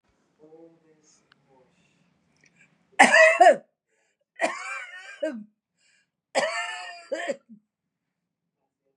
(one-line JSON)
{"three_cough_length": "9.0 s", "three_cough_amplitude": 31614, "three_cough_signal_mean_std_ratio": 0.28, "survey_phase": "beta (2021-08-13 to 2022-03-07)", "age": "45-64", "gender": "Female", "wearing_mask": "No", "symptom_runny_or_blocked_nose": true, "symptom_fatigue": true, "symptom_headache": true, "smoker_status": "Ex-smoker", "respiratory_condition_asthma": false, "respiratory_condition_other": false, "recruitment_source": "REACT", "submission_delay": "1 day", "covid_test_result": "Negative", "covid_test_method": "RT-qPCR", "influenza_a_test_result": "Negative", "influenza_b_test_result": "Negative"}